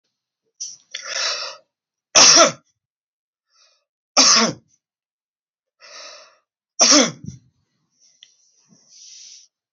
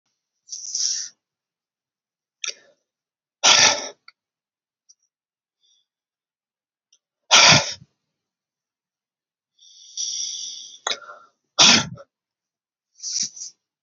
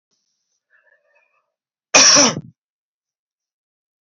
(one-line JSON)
{"three_cough_length": "9.7 s", "three_cough_amplitude": 32137, "three_cough_signal_mean_std_ratio": 0.3, "exhalation_length": "13.8 s", "exhalation_amplitude": 32768, "exhalation_signal_mean_std_ratio": 0.27, "cough_length": "4.0 s", "cough_amplitude": 30320, "cough_signal_mean_std_ratio": 0.26, "survey_phase": "beta (2021-08-13 to 2022-03-07)", "age": "65+", "gender": "Male", "wearing_mask": "No", "symptom_none": true, "smoker_status": "Never smoked", "respiratory_condition_asthma": false, "respiratory_condition_other": false, "recruitment_source": "REACT", "submission_delay": "2 days", "covid_test_result": "Negative", "covid_test_method": "RT-qPCR"}